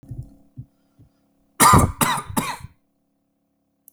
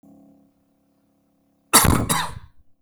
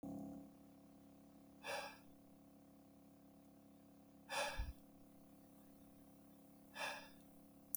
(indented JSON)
{
  "three_cough_length": "3.9 s",
  "three_cough_amplitude": 32768,
  "three_cough_signal_mean_std_ratio": 0.32,
  "cough_length": "2.8 s",
  "cough_amplitude": 32768,
  "cough_signal_mean_std_ratio": 0.33,
  "exhalation_length": "7.8 s",
  "exhalation_amplitude": 2397,
  "exhalation_signal_mean_std_ratio": 0.56,
  "survey_phase": "beta (2021-08-13 to 2022-03-07)",
  "age": "45-64",
  "gender": "Male",
  "wearing_mask": "No",
  "symptom_none": true,
  "smoker_status": "Never smoked",
  "respiratory_condition_asthma": false,
  "respiratory_condition_other": false,
  "recruitment_source": "REACT",
  "submission_delay": "1 day",
  "covid_test_result": "Negative",
  "covid_test_method": "RT-qPCR",
  "influenza_a_test_result": "Negative",
  "influenza_b_test_result": "Negative"
}